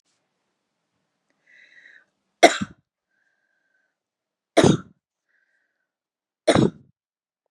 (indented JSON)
{
  "three_cough_length": "7.5 s",
  "three_cough_amplitude": 32768,
  "three_cough_signal_mean_std_ratio": 0.2,
  "survey_phase": "beta (2021-08-13 to 2022-03-07)",
  "age": "45-64",
  "gender": "Female",
  "wearing_mask": "No",
  "symptom_none": true,
  "smoker_status": "Never smoked",
  "respiratory_condition_asthma": false,
  "respiratory_condition_other": false,
  "recruitment_source": "REACT",
  "submission_delay": "1 day",
  "covid_test_result": "Negative",
  "covid_test_method": "RT-qPCR",
  "influenza_a_test_result": "Negative",
  "influenza_b_test_result": "Negative"
}